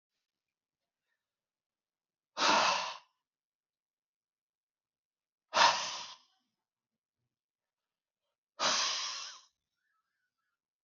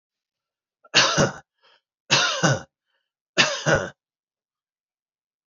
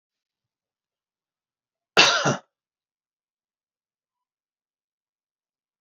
{"exhalation_length": "10.8 s", "exhalation_amplitude": 8714, "exhalation_signal_mean_std_ratio": 0.28, "three_cough_length": "5.5 s", "three_cough_amplitude": 24714, "three_cough_signal_mean_std_ratio": 0.37, "cough_length": "5.8 s", "cough_amplitude": 32015, "cough_signal_mean_std_ratio": 0.19, "survey_phase": "beta (2021-08-13 to 2022-03-07)", "age": "65+", "gender": "Male", "wearing_mask": "No", "symptom_none": true, "smoker_status": "Never smoked", "respiratory_condition_asthma": false, "respiratory_condition_other": false, "recruitment_source": "REACT", "submission_delay": "6 days", "covid_test_result": "Negative", "covid_test_method": "RT-qPCR", "influenza_a_test_result": "Negative", "influenza_b_test_result": "Negative"}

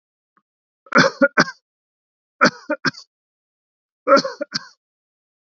{"three_cough_length": "5.5 s", "three_cough_amplitude": 29233, "three_cough_signal_mean_std_ratio": 0.28, "survey_phase": "beta (2021-08-13 to 2022-03-07)", "age": "65+", "gender": "Male", "wearing_mask": "No", "symptom_none": true, "smoker_status": "Never smoked", "respiratory_condition_asthma": false, "respiratory_condition_other": false, "recruitment_source": "REACT", "submission_delay": "2 days", "covid_test_result": "Negative", "covid_test_method": "RT-qPCR"}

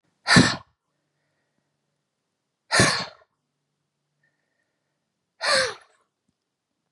{"exhalation_length": "6.9 s", "exhalation_amplitude": 29270, "exhalation_signal_mean_std_ratio": 0.26, "survey_phase": "beta (2021-08-13 to 2022-03-07)", "age": "45-64", "gender": "Female", "wearing_mask": "No", "symptom_none": true, "smoker_status": "Never smoked", "respiratory_condition_asthma": false, "respiratory_condition_other": false, "recruitment_source": "REACT", "submission_delay": "1 day", "covid_test_result": "Negative", "covid_test_method": "RT-qPCR"}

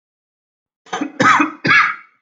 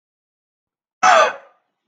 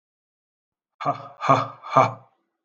{"three_cough_length": "2.2 s", "three_cough_amplitude": 30479, "three_cough_signal_mean_std_ratio": 0.47, "cough_length": "1.9 s", "cough_amplitude": 31345, "cough_signal_mean_std_ratio": 0.32, "exhalation_length": "2.6 s", "exhalation_amplitude": 26050, "exhalation_signal_mean_std_ratio": 0.33, "survey_phase": "beta (2021-08-13 to 2022-03-07)", "age": "18-44", "gender": "Male", "wearing_mask": "No", "symptom_none": true, "smoker_status": "Never smoked", "respiratory_condition_asthma": true, "respiratory_condition_other": false, "recruitment_source": "REACT", "submission_delay": "1 day", "covid_test_result": "Negative", "covid_test_method": "RT-qPCR"}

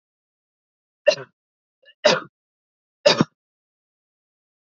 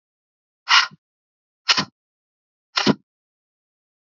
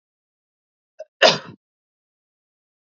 {"three_cough_length": "4.7 s", "three_cough_amplitude": 27371, "three_cough_signal_mean_std_ratio": 0.21, "exhalation_length": "4.2 s", "exhalation_amplitude": 30738, "exhalation_signal_mean_std_ratio": 0.24, "cough_length": "2.8 s", "cough_amplitude": 29329, "cough_signal_mean_std_ratio": 0.18, "survey_phase": "beta (2021-08-13 to 2022-03-07)", "age": "18-44", "gender": "Female", "wearing_mask": "No", "symptom_none": true, "smoker_status": "Never smoked", "respiratory_condition_asthma": false, "respiratory_condition_other": false, "recruitment_source": "REACT", "submission_delay": "1 day", "covid_test_result": "Negative", "covid_test_method": "RT-qPCR", "influenza_a_test_result": "Negative", "influenza_b_test_result": "Negative"}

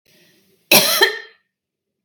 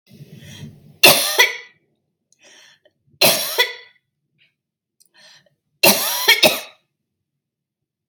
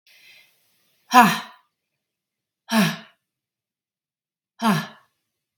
{"cough_length": "2.0 s", "cough_amplitude": 32768, "cough_signal_mean_std_ratio": 0.35, "three_cough_length": "8.1 s", "three_cough_amplitude": 32768, "three_cough_signal_mean_std_ratio": 0.33, "exhalation_length": "5.6 s", "exhalation_amplitude": 32768, "exhalation_signal_mean_std_ratio": 0.26, "survey_phase": "beta (2021-08-13 to 2022-03-07)", "age": "18-44", "gender": "Female", "wearing_mask": "No", "symptom_cough_any": true, "smoker_status": "Never smoked", "respiratory_condition_asthma": false, "respiratory_condition_other": false, "recruitment_source": "REACT", "submission_delay": "1 day", "covid_test_result": "Negative", "covid_test_method": "RT-qPCR"}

